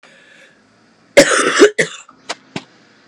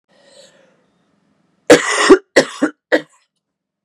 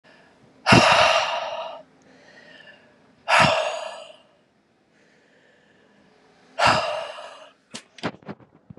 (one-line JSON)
{"cough_length": "3.1 s", "cough_amplitude": 32768, "cough_signal_mean_std_ratio": 0.35, "three_cough_length": "3.8 s", "three_cough_amplitude": 32768, "three_cough_signal_mean_std_ratio": 0.31, "exhalation_length": "8.8 s", "exhalation_amplitude": 31912, "exhalation_signal_mean_std_ratio": 0.38, "survey_phase": "beta (2021-08-13 to 2022-03-07)", "age": "18-44", "gender": "Female", "wearing_mask": "No", "symptom_cough_any": true, "symptom_runny_or_blocked_nose": true, "symptom_fever_high_temperature": true, "symptom_onset": "3 days", "smoker_status": "Never smoked", "respiratory_condition_asthma": false, "respiratory_condition_other": false, "recruitment_source": "Test and Trace", "submission_delay": "1 day", "covid_test_result": "Positive", "covid_test_method": "RT-qPCR", "covid_ct_value": 23.3, "covid_ct_gene": "ORF1ab gene"}